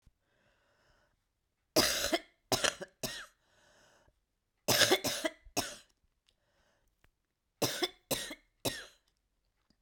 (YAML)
three_cough_length: 9.8 s
three_cough_amplitude: 11605
three_cough_signal_mean_std_ratio: 0.32
survey_phase: beta (2021-08-13 to 2022-03-07)
age: 65+
gender: Female
wearing_mask: 'No'
symptom_cough_any: true
symptom_new_continuous_cough: true
symptom_runny_or_blocked_nose: true
symptom_sore_throat: true
symptom_fatigue: true
symptom_headache: true
smoker_status: Never smoked
respiratory_condition_asthma: false
respiratory_condition_other: false
recruitment_source: Test and Trace
submission_delay: 0 days
covid_test_result: Positive
covid_test_method: LFT